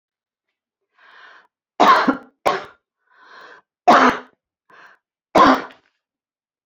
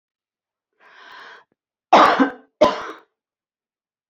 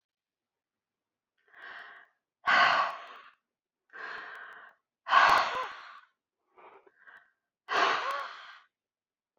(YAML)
three_cough_length: 6.7 s
three_cough_amplitude: 30236
three_cough_signal_mean_std_ratio: 0.31
cough_length: 4.1 s
cough_amplitude: 27992
cough_signal_mean_std_ratio: 0.28
exhalation_length: 9.4 s
exhalation_amplitude: 12242
exhalation_signal_mean_std_ratio: 0.35
survey_phase: beta (2021-08-13 to 2022-03-07)
age: 65+
gender: Female
wearing_mask: 'No'
symptom_none: true
smoker_status: Ex-smoker
respiratory_condition_asthma: false
respiratory_condition_other: false
recruitment_source: REACT
submission_delay: 0 days
covid_test_result: Negative
covid_test_method: RT-qPCR